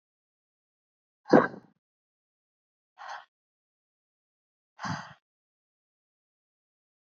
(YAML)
exhalation_length: 7.1 s
exhalation_amplitude: 21947
exhalation_signal_mean_std_ratio: 0.14
survey_phase: beta (2021-08-13 to 2022-03-07)
age: 18-44
gender: Female
wearing_mask: 'No'
symptom_none: true
smoker_status: Never smoked
respiratory_condition_asthma: false
respiratory_condition_other: false
recruitment_source: REACT
submission_delay: 2 days
covid_test_result: Negative
covid_test_method: RT-qPCR
influenza_a_test_result: Negative
influenza_b_test_result: Negative